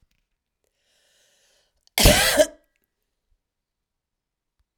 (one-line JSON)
{"cough_length": "4.8 s", "cough_amplitude": 31996, "cough_signal_mean_std_ratio": 0.24, "survey_phase": "alpha (2021-03-01 to 2021-08-12)", "age": "45-64", "gender": "Female", "wearing_mask": "No", "symptom_none": true, "smoker_status": "Ex-smoker", "respiratory_condition_asthma": true, "respiratory_condition_other": false, "recruitment_source": "REACT", "submission_delay": "2 days", "covid_test_result": "Negative", "covid_test_method": "RT-qPCR"}